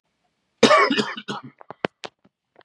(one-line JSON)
{"cough_length": "2.6 s", "cough_amplitude": 28762, "cough_signal_mean_std_ratio": 0.34, "survey_phase": "beta (2021-08-13 to 2022-03-07)", "age": "45-64", "gender": "Male", "wearing_mask": "No", "symptom_cough_any": true, "symptom_runny_or_blocked_nose": true, "symptom_abdominal_pain": true, "symptom_fatigue": true, "symptom_headache": true, "symptom_onset": "5 days", "smoker_status": "Never smoked", "respiratory_condition_asthma": false, "respiratory_condition_other": false, "recruitment_source": "Test and Trace", "submission_delay": "1 day", "covid_test_result": "Positive", "covid_test_method": "RT-qPCR", "covid_ct_value": 18.4, "covid_ct_gene": "ORF1ab gene"}